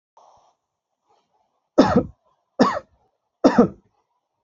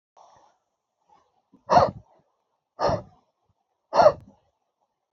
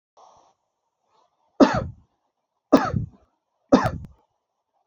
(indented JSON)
{
  "cough_length": "4.4 s",
  "cough_amplitude": 29801,
  "cough_signal_mean_std_ratio": 0.28,
  "exhalation_length": "5.1 s",
  "exhalation_amplitude": 24347,
  "exhalation_signal_mean_std_ratio": 0.25,
  "three_cough_length": "4.9 s",
  "three_cough_amplitude": 27603,
  "three_cough_signal_mean_std_ratio": 0.26,
  "survey_phase": "alpha (2021-03-01 to 2021-08-12)",
  "age": "45-64",
  "gender": "Male",
  "wearing_mask": "No",
  "symptom_none": true,
  "smoker_status": "Never smoked",
  "respiratory_condition_asthma": false,
  "respiratory_condition_other": false,
  "recruitment_source": "REACT",
  "submission_delay": "1 day",
  "covid_test_result": "Negative",
  "covid_test_method": "RT-qPCR"
}